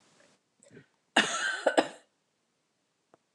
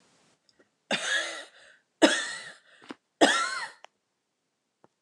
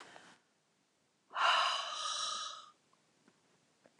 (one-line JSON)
{"cough_length": "3.3 s", "cough_amplitude": 13356, "cough_signal_mean_std_ratio": 0.29, "three_cough_length": "5.0 s", "three_cough_amplitude": 21534, "three_cough_signal_mean_std_ratio": 0.34, "exhalation_length": "4.0 s", "exhalation_amplitude": 4105, "exhalation_signal_mean_std_ratio": 0.43, "survey_phase": "beta (2021-08-13 to 2022-03-07)", "age": "45-64", "gender": "Female", "wearing_mask": "No", "symptom_none": true, "smoker_status": "Never smoked", "respiratory_condition_asthma": false, "respiratory_condition_other": false, "recruitment_source": "Test and Trace", "submission_delay": "0 days", "covid_test_result": "Negative", "covid_test_method": "ePCR"}